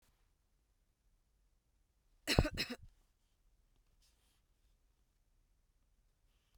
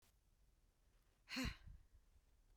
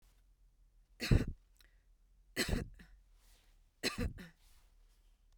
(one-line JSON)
{"cough_length": "6.6 s", "cough_amplitude": 9500, "cough_signal_mean_std_ratio": 0.18, "exhalation_length": "2.6 s", "exhalation_amplitude": 707, "exhalation_signal_mean_std_ratio": 0.36, "three_cough_length": "5.4 s", "three_cough_amplitude": 5522, "three_cough_signal_mean_std_ratio": 0.3, "survey_phase": "beta (2021-08-13 to 2022-03-07)", "age": "45-64", "gender": "Female", "wearing_mask": "No", "symptom_runny_or_blocked_nose": true, "symptom_abdominal_pain": true, "smoker_status": "Never smoked", "respiratory_condition_asthma": false, "respiratory_condition_other": false, "recruitment_source": "REACT", "submission_delay": "1 day", "covid_test_result": "Negative", "covid_test_method": "RT-qPCR", "influenza_a_test_result": "Negative", "influenza_b_test_result": "Negative"}